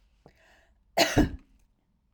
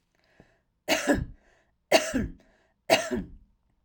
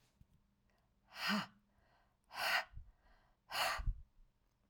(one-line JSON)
{"cough_length": "2.1 s", "cough_amplitude": 13812, "cough_signal_mean_std_ratio": 0.3, "three_cough_length": "3.8 s", "three_cough_amplitude": 16569, "three_cough_signal_mean_std_ratio": 0.38, "exhalation_length": "4.7 s", "exhalation_amplitude": 2364, "exhalation_signal_mean_std_ratio": 0.4, "survey_phase": "alpha (2021-03-01 to 2021-08-12)", "age": "45-64", "gender": "Female", "wearing_mask": "No", "symptom_none": true, "smoker_status": "Never smoked", "respiratory_condition_asthma": false, "respiratory_condition_other": false, "recruitment_source": "REACT", "submission_delay": "1 day", "covid_test_result": "Negative", "covid_test_method": "RT-qPCR"}